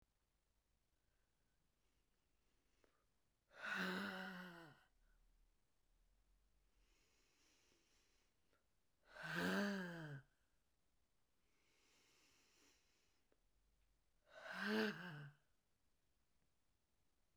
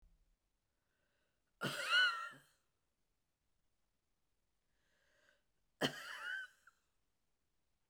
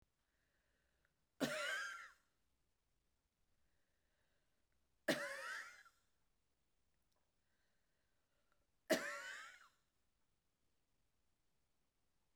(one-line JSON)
{"exhalation_length": "17.4 s", "exhalation_amplitude": 1173, "exhalation_signal_mean_std_ratio": 0.34, "cough_length": "7.9 s", "cough_amplitude": 2979, "cough_signal_mean_std_ratio": 0.27, "three_cough_length": "12.4 s", "three_cough_amplitude": 2066, "three_cough_signal_mean_std_ratio": 0.28, "survey_phase": "beta (2021-08-13 to 2022-03-07)", "age": "65+", "gender": "Female", "wearing_mask": "No", "symptom_shortness_of_breath": true, "symptom_fatigue": true, "symptom_onset": "13 days", "smoker_status": "Ex-smoker", "respiratory_condition_asthma": false, "respiratory_condition_other": false, "recruitment_source": "REACT", "submission_delay": "1 day", "covid_test_result": "Negative", "covid_test_method": "RT-qPCR"}